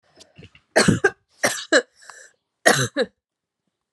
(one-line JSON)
{"three_cough_length": "3.9 s", "three_cough_amplitude": 32765, "three_cough_signal_mean_std_ratio": 0.35, "survey_phase": "beta (2021-08-13 to 2022-03-07)", "age": "18-44", "gender": "Female", "wearing_mask": "No", "symptom_cough_any": true, "symptom_runny_or_blocked_nose": true, "symptom_shortness_of_breath": true, "symptom_sore_throat": true, "symptom_abdominal_pain": true, "symptom_fatigue": true, "symptom_fever_high_temperature": true, "symptom_headache": true, "symptom_change_to_sense_of_smell_or_taste": true, "symptom_loss_of_taste": true, "symptom_other": true, "symptom_onset": "3 days", "smoker_status": "Ex-smoker", "respiratory_condition_asthma": false, "respiratory_condition_other": false, "recruitment_source": "Test and Trace", "submission_delay": "1 day", "covid_test_result": "Positive", "covid_test_method": "RT-qPCR", "covid_ct_value": 19.7, "covid_ct_gene": "ORF1ab gene"}